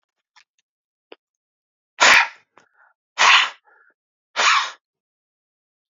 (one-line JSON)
{"exhalation_length": "6.0 s", "exhalation_amplitude": 30271, "exhalation_signal_mean_std_ratio": 0.3, "survey_phase": "alpha (2021-03-01 to 2021-08-12)", "age": "45-64", "gender": "Male", "wearing_mask": "No", "symptom_none": true, "smoker_status": "Current smoker (11 or more cigarettes per day)", "respiratory_condition_asthma": false, "respiratory_condition_other": false, "recruitment_source": "REACT", "submission_delay": "1 day", "covid_test_result": "Negative", "covid_test_method": "RT-qPCR"}